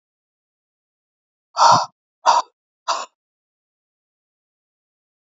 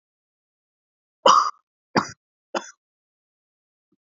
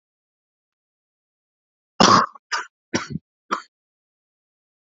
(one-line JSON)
{"exhalation_length": "5.3 s", "exhalation_amplitude": 27930, "exhalation_signal_mean_std_ratio": 0.24, "three_cough_length": "4.2 s", "three_cough_amplitude": 26926, "three_cough_signal_mean_std_ratio": 0.22, "cough_length": "4.9 s", "cough_amplitude": 29501, "cough_signal_mean_std_ratio": 0.23, "survey_phase": "beta (2021-08-13 to 2022-03-07)", "age": "18-44", "gender": "Male", "wearing_mask": "No", "symptom_cough_any": true, "symptom_new_continuous_cough": true, "symptom_sore_throat": true, "symptom_headache": true, "symptom_onset": "3 days", "smoker_status": "Never smoked", "respiratory_condition_asthma": false, "respiratory_condition_other": false, "recruitment_source": "Test and Trace", "submission_delay": "2 days", "covid_test_result": "Positive", "covid_test_method": "RT-qPCR", "covid_ct_value": 24.1, "covid_ct_gene": "N gene"}